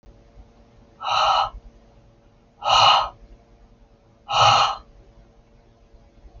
{"exhalation_length": "6.4 s", "exhalation_amplitude": 24562, "exhalation_signal_mean_std_ratio": 0.4, "survey_phase": "beta (2021-08-13 to 2022-03-07)", "age": "45-64", "gender": "Female", "wearing_mask": "No", "symptom_runny_or_blocked_nose": true, "symptom_onset": "12 days", "smoker_status": "Ex-smoker", "respiratory_condition_asthma": false, "respiratory_condition_other": false, "recruitment_source": "REACT", "submission_delay": "1 day", "covid_test_result": "Negative", "covid_test_method": "RT-qPCR"}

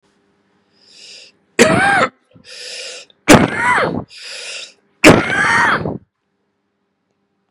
{"three_cough_length": "7.5 s", "three_cough_amplitude": 32768, "three_cough_signal_mean_std_ratio": 0.42, "survey_phase": "beta (2021-08-13 to 2022-03-07)", "age": "45-64", "gender": "Male", "wearing_mask": "No", "symptom_cough_any": true, "symptom_runny_or_blocked_nose": true, "symptom_shortness_of_breath": true, "symptom_fatigue": true, "smoker_status": "Ex-smoker", "respiratory_condition_asthma": false, "respiratory_condition_other": false, "recruitment_source": "Test and Trace", "submission_delay": "2 days", "covid_test_result": "Positive", "covid_test_method": "RT-qPCR", "covid_ct_value": 18.6, "covid_ct_gene": "ORF1ab gene"}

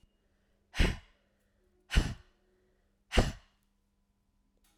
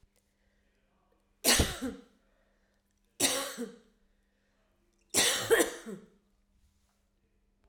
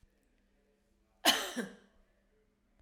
{"exhalation_length": "4.8 s", "exhalation_amplitude": 10832, "exhalation_signal_mean_std_ratio": 0.25, "three_cough_length": "7.7 s", "three_cough_amplitude": 10266, "three_cough_signal_mean_std_ratio": 0.32, "cough_length": "2.8 s", "cough_amplitude": 9223, "cough_signal_mean_std_ratio": 0.25, "survey_phase": "alpha (2021-03-01 to 2021-08-12)", "age": "45-64", "gender": "Female", "wearing_mask": "No", "symptom_none": true, "smoker_status": "Ex-smoker", "respiratory_condition_asthma": false, "respiratory_condition_other": false, "recruitment_source": "REACT", "submission_delay": "2 days", "covid_test_result": "Negative", "covid_test_method": "RT-qPCR"}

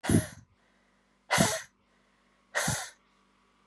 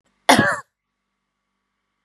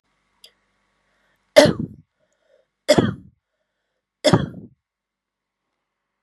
{"exhalation_length": "3.7 s", "exhalation_amplitude": 10092, "exhalation_signal_mean_std_ratio": 0.36, "cough_length": "2.0 s", "cough_amplitude": 32642, "cough_signal_mean_std_ratio": 0.27, "three_cough_length": "6.2 s", "three_cough_amplitude": 32768, "three_cough_signal_mean_std_ratio": 0.23, "survey_phase": "beta (2021-08-13 to 2022-03-07)", "age": "18-44", "gender": "Female", "wearing_mask": "No", "symptom_cough_any": true, "symptom_runny_or_blocked_nose": true, "symptom_sore_throat": true, "symptom_headache": true, "smoker_status": "Never smoked", "respiratory_condition_asthma": false, "respiratory_condition_other": false, "recruitment_source": "Test and Trace", "submission_delay": "2 days", "covid_test_result": "Positive", "covid_test_method": "RT-qPCR", "covid_ct_value": 19.0, "covid_ct_gene": "ORF1ab gene", "covid_ct_mean": 19.3, "covid_viral_load": "450000 copies/ml", "covid_viral_load_category": "Low viral load (10K-1M copies/ml)"}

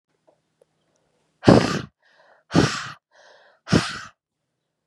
{"exhalation_length": "4.9 s", "exhalation_amplitude": 32411, "exhalation_signal_mean_std_ratio": 0.28, "survey_phase": "beta (2021-08-13 to 2022-03-07)", "age": "18-44", "gender": "Female", "wearing_mask": "No", "symptom_runny_or_blocked_nose": true, "symptom_sore_throat": true, "symptom_fever_high_temperature": true, "symptom_headache": true, "symptom_onset": "1 day", "smoker_status": "Never smoked", "respiratory_condition_asthma": false, "respiratory_condition_other": false, "recruitment_source": "Test and Trace", "submission_delay": "1 day", "covid_test_result": "Positive", "covid_test_method": "RT-qPCR", "covid_ct_value": 18.0, "covid_ct_gene": "N gene", "covid_ct_mean": 18.1, "covid_viral_load": "1100000 copies/ml", "covid_viral_load_category": "High viral load (>1M copies/ml)"}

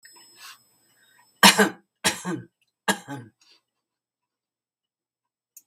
{"three_cough_length": "5.7 s", "three_cough_amplitude": 32768, "three_cough_signal_mean_std_ratio": 0.22, "survey_phase": "beta (2021-08-13 to 2022-03-07)", "age": "65+", "gender": "Female", "wearing_mask": "No", "symptom_none": true, "smoker_status": "Ex-smoker", "respiratory_condition_asthma": false, "respiratory_condition_other": false, "recruitment_source": "REACT", "submission_delay": "1 day", "covid_test_result": "Negative", "covid_test_method": "RT-qPCR", "influenza_a_test_result": "Negative", "influenza_b_test_result": "Negative"}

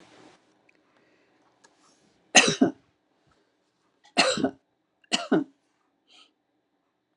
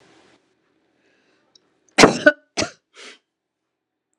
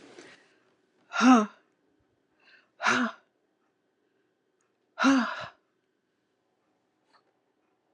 {"three_cough_length": "7.2 s", "three_cough_amplitude": 29934, "three_cough_signal_mean_std_ratio": 0.25, "cough_length": "4.2 s", "cough_amplitude": 32768, "cough_signal_mean_std_ratio": 0.2, "exhalation_length": "7.9 s", "exhalation_amplitude": 14242, "exhalation_signal_mean_std_ratio": 0.27, "survey_phase": "beta (2021-08-13 to 2022-03-07)", "age": "65+", "gender": "Female", "wearing_mask": "No", "symptom_runny_or_blocked_nose": true, "symptom_onset": "12 days", "smoker_status": "Ex-smoker", "respiratory_condition_asthma": false, "respiratory_condition_other": false, "recruitment_source": "REACT", "submission_delay": "2 days", "covid_test_result": "Negative", "covid_test_method": "RT-qPCR"}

